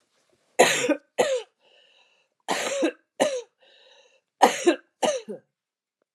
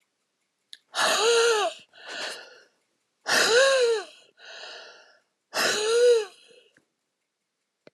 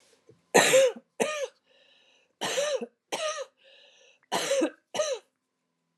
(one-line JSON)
{"three_cough_length": "6.1 s", "three_cough_amplitude": 26992, "three_cough_signal_mean_std_ratio": 0.39, "exhalation_length": "7.9 s", "exhalation_amplitude": 12406, "exhalation_signal_mean_std_ratio": 0.5, "cough_length": "6.0 s", "cough_amplitude": 19026, "cough_signal_mean_std_ratio": 0.43, "survey_phase": "alpha (2021-03-01 to 2021-08-12)", "age": "65+", "gender": "Female", "wearing_mask": "No", "symptom_none": true, "smoker_status": "Never smoked", "respiratory_condition_asthma": false, "respiratory_condition_other": false, "recruitment_source": "REACT", "submission_delay": "1 day", "covid_test_result": "Negative", "covid_test_method": "RT-qPCR"}